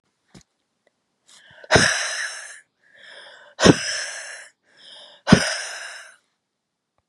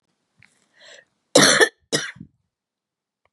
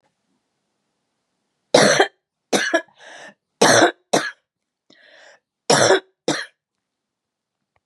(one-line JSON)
{"exhalation_length": "7.1 s", "exhalation_amplitude": 32768, "exhalation_signal_mean_std_ratio": 0.31, "cough_length": "3.3 s", "cough_amplitude": 31111, "cough_signal_mean_std_ratio": 0.28, "three_cough_length": "7.9 s", "three_cough_amplitude": 32389, "three_cough_signal_mean_std_ratio": 0.33, "survey_phase": "beta (2021-08-13 to 2022-03-07)", "age": "45-64", "gender": "Female", "wearing_mask": "No", "symptom_cough_any": true, "symptom_runny_or_blocked_nose": true, "symptom_headache": true, "symptom_onset": "3 days", "smoker_status": "Ex-smoker", "respiratory_condition_asthma": false, "respiratory_condition_other": false, "recruitment_source": "Test and Trace", "submission_delay": "0 days", "covid_test_result": "Positive", "covid_test_method": "RT-qPCR", "covid_ct_value": 21.2, "covid_ct_gene": "ORF1ab gene"}